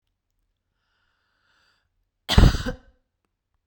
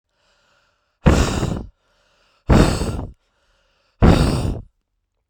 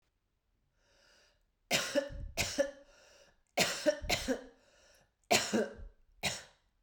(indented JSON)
{
  "cough_length": "3.7 s",
  "cough_amplitude": 32767,
  "cough_signal_mean_std_ratio": 0.2,
  "exhalation_length": "5.3 s",
  "exhalation_amplitude": 32768,
  "exhalation_signal_mean_std_ratio": 0.41,
  "three_cough_length": "6.8 s",
  "three_cough_amplitude": 9146,
  "three_cough_signal_mean_std_ratio": 0.42,
  "survey_phase": "beta (2021-08-13 to 2022-03-07)",
  "age": "18-44",
  "gender": "Female",
  "wearing_mask": "No",
  "symptom_runny_or_blocked_nose": true,
  "symptom_onset": "13 days",
  "smoker_status": "Ex-smoker",
  "respiratory_condition_asthma": false,
  "respiratory_condition_other": false,
  "recruitment_source": "REACT",
  "submission_delay": "6 days",
  "covid_test_result": "Negative",
  "covid_test_method": "RT-qPCR",
  "influenza_a_test_result": "Negative",
  "influenza_b_test_result": "Negative"
}